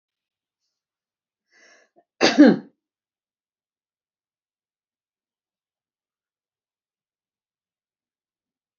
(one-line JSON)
{"cough_length": "8.8 s", "cough_amplitude": 28956, "cough_signal_mean_std_ratio": 0.14, "survey_phase": "alpha (2021-03-01 to 2021-08-12)", "age": "65+", "gender": "Female", "wearing_mask": "No", "symptom_none": true, "smoker_status": "Never smoked", "respiratory_condition_asthma": false, "respiratory_condition_other": false, "recruitment_source": "REACT", "submission_delay": "1 day", "covid_test_result": "Negative", "covid_test_method": "RT-qPCR"}